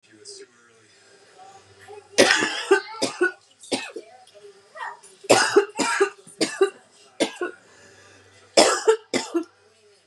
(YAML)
three_cough_length: 10.1 s
three_cough_amplitude: 31804
three_cough_signal_mean_std_ratio: 0.4
survey_phase: beta (2021-08-13 to 2022-03-07)
age: 18-44
gender: Female
wearing_mask: 'No'
symptom_cough_any: true
symptom_new_continuous_cough: true
symptom_runny_or_blocked_nose: true
symptom_shortness_of_breath: true
symptom_sore_throat: true
symptom_diarrhoea: true
symptom_fatigue: true
symptom_headache: true
symptom_change_to_sense_of_smell_or_taste: true
symptom_onset: 3 days
smoker_status: Never smoked
respiratory_condition_asthma: false
respiratory_condition_other: false
recruitment_source: Test and Trace
submission_delay: 1 day
covid_test_result: Positive
covid_test_method: RT-qPCR
covid_ct_value: 21.3
covid_ct_gene: ORF1ab gene